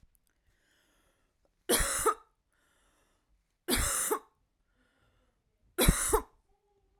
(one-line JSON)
{"three_cough_length": "7.0 s", "three_cough_amplitude": 12443, "three_cough_signal_mean_std_ratio": 0.34, "survey_phase": "alpha (2021-03-01 to 2021-08-12)", "age": "18-44", "gender": "Female", "wearing_mask": "No", "symptom_none": true, "smoker_status": "Never smoked", "respiratory_condition_asthma": true, "respiratory_condition_other": false, "recruitment_source": "REACT", "submission_delay": "1 day", "covid_test_result": "Negative", "covid_test_method": "RT-qPCR"}